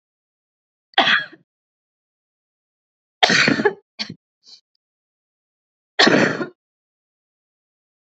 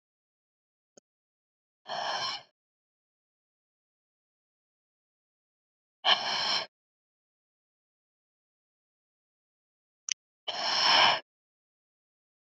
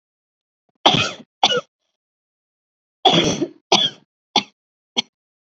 {"three_cough_length": "8.0 s", "three_cough_amplitude": 31400, "three_cough_signal_mean_std_ratio": 0.29, "exhalation_length": "12.5 s", "exhalation_amplitude": 11644, "exhalation_signal_mean_std_ratio": 0.26, "cough_length": "5.5 s", "cough_amplitude": 31360, "cough_signal_mean_std_ratio": 0.33, "survey_phase": "beta (2021-08-13 to 2022-03-07)", "age": "18-44", "gender": "Female", "wearing_mask": "No", "symptom_cough_any": true, "symptom_runny_or_blocked_nose": true, "symptom_abdominal_pain": true, "symptom_fatigue": true, "symptom_headache": true, "symptom_change_to_sense_of_smell_or_taste": true, "smoker_status": "Current smoker (e-cigarettes or vapes only)", "respiratory_condition_asthma": false, "respiratory_condition_other": false, "recruitment_source": "Test and Trace", "submission_delay": "2 days", "covid_test_result": "Positive", "covid_test_method": "RT-qPCR", "covid_ct_value": 21.2, "covid_ct_gene": "ORF1ab gene", "covid_ct_mean": 21.6, "covid_viral_load": "81000 copies/ml", "covid_viral_load_category": "Low viral load (10K-1M copies/ml)"}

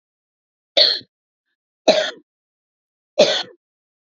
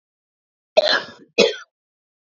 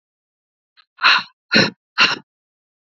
{"three_cough_length": "4.1 s", "three_cough_amplitude": 30245, "three_cough_signal_mean_std_ratio": 0.3, "cough_length": "2.2 s", "cough_amplitude": 30778, "cough_signal_mean_std_ratio": 0.32, "exhalation_length": "2.8 s", "exhalation_amplitude": 30046, "exhalation_signal_mean_std_ratio": 0.34, "survey_phase": "beta (2021-08-13 to 2022-03-07)", "age": "18-44", "gender": "Female", "wearing_mask": "No", "symptom_headache": true, "smoker_status": "Ex-smoker", "respiratory_condition_asthma": false, "respiratory_condition_other": false, "recruitment_source": "Test and Trace", "submission_delay": "2 days", "covid_test_result": "Positive", "covid_test_method": "RT-qPCR", "covid_ct_value": 30.1, "covid_ct_gene": "ORF1ab gene"}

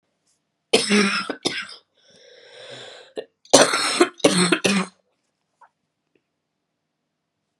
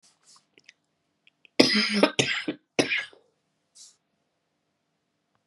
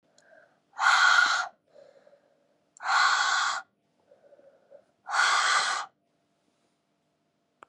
{"cough_length": "7.6 s", "cough_amplitude": 32768, "cough_signal_mean_std_ratio": 0.36, "three_cough_length": "5.5 s", "three_cough_amplitude": 30712, "three_cough_signal_mean_std_ratio": 0.3, "exhalation_length": "7.7 s", "exhalation_amplitude": 11510, "exhalation_signal_mean_std_ratio": 0.45, "survey_phase": "beta (2021-08-13 to 2022-03-07)", "age": "18-44", "gender": "Female", "wearing_mask": "No", "symptom_cough_any": true, "symptom_runny_or_blocked_nose": true, "symptom_sore_throat": true, "symptom_headache": true, "symptom_change_to_sense_of_smell_or_taste": true, "symptom_loss_of_taste": true, "symptom_onset": "3 days", "smoker_status": "Ex-smoker", "respiratory_condition_asthma": false, "respiratory_condition_other": false, "recruitment_source": "Test and Trace", "submission_delay": "2 days", "covid_test_result": "Positive", "covid_test_method": "RT-qPCR", "covid_ct_value": 17.9, "covid_ct_gene": "ORF1ab gene", "covid_ct_mean": 18.1, "covid_viral_load": "1100000 copies/ml", "covid_viral_load_category": "High viral load (>1M copies/ml)"}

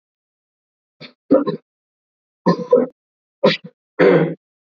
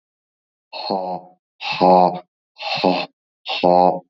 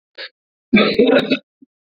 {"three_cough_length": "4.6 s", "three_cough_amplitude": 27378, "three_cough_signal_mean_std_ratio": 0.36, "exhalation_length": "4.1 s", "exhalation_amplitude": 31575, "exhalation_signal_mean_std_ratio": 0.46, "cough_length": "2.0 s", "cough_amplitude": 27516, "cough_signal_mean_std_ratio": 0.46, "survey_phase": "beta (2021-08-13 to 2022-03-07)", "age": "18-44", "gender": "Male", "wearing_mask": "No", "symptom_cough_any": true, "symptom_sore_throat": true, "symptom_fatigue": true, "symptom_fever_high_temperature": true, "smoker_status": "Never smoked", "respiratory_condition_asthma": false, "respiratory_condition_other": false, "recruitment_source": "Test and Trace", "submission_delay": "1 day", "covid_test_result": "Positive", "covid_test_method": "LFT"}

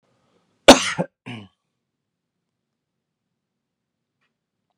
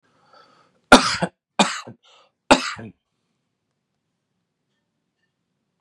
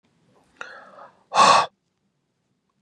{"cough_length": "4.8 s", "cough_amplitude": 32768, "cough_signal_mean_std_ratio": 0.14, "three_cough_length": "5.8 s", "three_cough_amplitude": 32768, "three_cough_signal_mean_std_ratio": 0.21, "exhalation_length": "2.8 s", "exhalation_amplitude": 25730, "exhalation_signal_mean_std_ratio": 0.28, "survey_phase": "beta (2021-08-13 to 2022-03-07)", "age": "45-64", "gender": "Male", "wearing_mask": "No", "symptom_none": true, "smoker_status": "Ex-smoker", "respiratory_condition_asthma": false, "respiratory_condition_other": false, "recruitment_source": "REACT", "submission_delay": "3 days", "covid_test_result": "Negative", "covid_test_method": "RT-qPCR", "influenza_a_test_result": "Negative", "influenza_b_test_result": "Negative"}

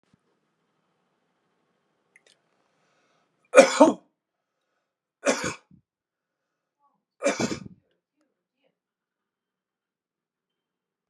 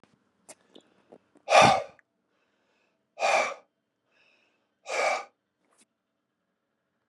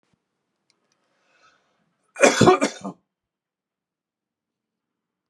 {"three_cough_length": "11.1 s", "three_cough_amplitude": 32136, "three_cough_signal_mean_std_ratio": 0.17, "exhalation_length": "7.1 s", "exhalation_amplitude": 20407, "exhalation_signal_mean_std_ratio": 0.27, "cough_length": "5.3 s", "cough_amplitude": 31769, "cough_signal_mean_std_ratio": 0.22, "survey_phase": "alpha (2021-03-01 to 2021-08-12)", "age": "45-64", "gender": "Male", "wearing_mask": "No", "symptom_none": true, "smoker_status": "Never smoked", "respiratory_condition_asthma": false, "respiratory_condition_other": false, "recruitment_source": "REACT", "submission_delay": "2 days", "covid_test_result": "Negative", "covid_test_method": "RT-qPCR"}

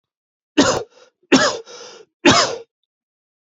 {"three_cough_length": "3.5 s", "three_cough_amplitude": 31095, "three_cough_signal_mean_std_ratio": 0.37, "survey_phase": "alpha (2021-03-01 to 2021-08-12)", "age": "18-44", "gender": "Male", "wearing_mask": "No", "symptom_cough_any": true, "symptom_shortness_of_breath": true, "symptom_fatigue": true, "symptom_headache": true, "symptom_change_to_sense_of_smell_or_taste": true, "symptom_onset": "3 days", "smoker_status": "Never smoked", "respiratory_condition_asthma": false, "respiratory_condition_other": false, "recruitment_source": "Test and Trace", "submission_delay": "1 day", "covid_test_result": "Positive", "covid_test_method": "RT-qPCR", "covid_ct_value": 18.8, "covid_ct_gene": "ORF1ab gene", "covid_ct_mean": 19.6, "covid_viral_load": "370000 copies/ml", "covid_viral_load_category": "Low viral load (10K-1M copies/ml)"}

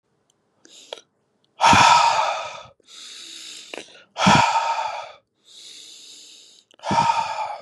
{"exhalation_length": "7.6 s", "exhalation_amplitude": 28160, "exhalation_signal_mean_std_ratio": 0.46, "survey_phase": "beta (2021-08-13 to 2022-03-07)", "age": "18-44", "gender": "Male", "wearing_mask": "No", "symptom_sore_throat": true, "symptom_fatigue": true, "symptom_onset": "3 days", "smoker_status": "Never smoked", "respiratory_condition_asthma": false, "respiratory_condition_other": false, "recruitment_source": "Test and Trace", "submission_delay": "2 days", "covid_test_result": "Positive", "covid_test_method": "RT-qPCR"}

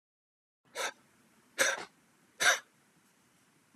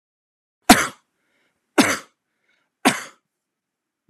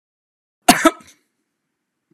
{"exhalation_length": "3.8 s", "exhalation_amplitude": 8226, "exhalation_signal_mean_std_ratio": 0.29, "three_cough_length": "4.1 s", "three_cough_amplitude": 32768, "three_cough_signal_mean_std_ratio": 0.23, "cough_length": "2.1 s", "cough_amplitude": 32768, "cough_signal_mean_std_ratio": 0.21, "survey_phase": "alpha (2021-03-01 to 2021-08-12)", "age": "45-64", "gender": "Male", "wearing_mask": "No", "symptom_none": true, "smoker_status": "Never smoked", "respiratory_condition_asthma": false, "respiratory_condition_other": false, "recruitment_source": "REACT", "submission_delay": "1 day", "covid_test_result": "Negative", "covid_test_method": "RT-qPCR"}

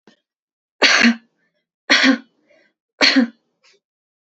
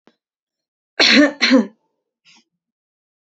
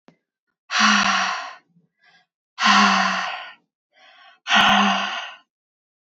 {"three_cough_length": "4.3 s", "three_cough_amplitude": 32767, "three_cough_signal_mean_std_ratio": 0.37, "cough_length": "3.3 s", "cough_amplitude": 30635, "cough_signal_mean_std_ratio": 0.33, "exhalation_length": "6.1 s", "exhalation_amplitude": 26019, "exhalation_signal_mean_std_ratio": 0.5, "survey_phase": "beta (2021-08-13 to 2022-03-07)", "age": "18-44", "gender": "Female", "wearing_mask": "No", "symptom_none": true, "smoker_status": "Never smoked", "respiratory_condition_asthma": false, "respiratory_condition_other": false, "recruitment_source": "Test and Trace", "submission_delay": "2 days", "covid_test_result": "Negative", "covid_test_method": "ePCR"}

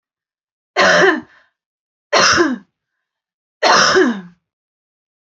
{"three_cough_length": "5.3 s", "three_cough_amplitude": 30943, "three_cough_signal_mean_std_ratio": 0.44, "survey_phase": "beta (2021-08-13 to 2022-03-07)", "age": "45-64", "gender": "Female", "wearing_mask": "No", "symptom_abdominal_pain": true, "symptom_headache": true, "smoker_status": "Ex-smoker", "respiratory_condition_asthma": false, "respiratory_condition_other": false, "recruitment_source": "Test and Trace", "submission_delay": "0 days", "covid_test_result": "Negative", "covid_test_method": "LFT"}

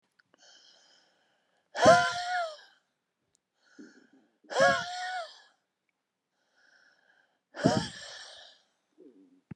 {"exhalation_length": "9.6 s", "exhalation_amplitude": 13430, "exhalation_signal_mean_std_ratio": 0.29, "survey_phase": "beta (2021-08-13 to 2022-03-07)", "age": "65+", "gender": "Male", "wearing_mask": "No", "symptom_none": true, "smoker_status": "Never smoked", "respiratory_condition_asthma": false, "respiratory_condition_other": false, "recruitment_source": "REACT", "submission_delay": "1 day", "covid_test_result": "Negative", "covid_test_method": "RT-qPCR", "influenza_a_test_result": "Negative", "influenza_b_test_result": "Negative"}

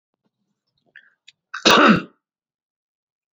{"cough_length": "3.3 s", "cough_amplitude": 28924, "cough_signal_mean_std_ratio": 0.27, "survey_phase": "beta (2021-08-13 to 2022-03-07)", "age": "45-64", "gender": "Male", "wearing_mask": "No", "symptom_cough_any": true, "smoker_status": "Current smoker (11 or more cigarettes per day)", "respiratory_condition_asthma": false, "respiratory_condition_other": false, "recruitment_source": "REACT", "submission_delay": "2 days", "covid_test_result": "Negative", "covid_test_method": "RT-qPCR", "influenza_a_test_result": "Negative", "influenza_b_test_result": "Negative"}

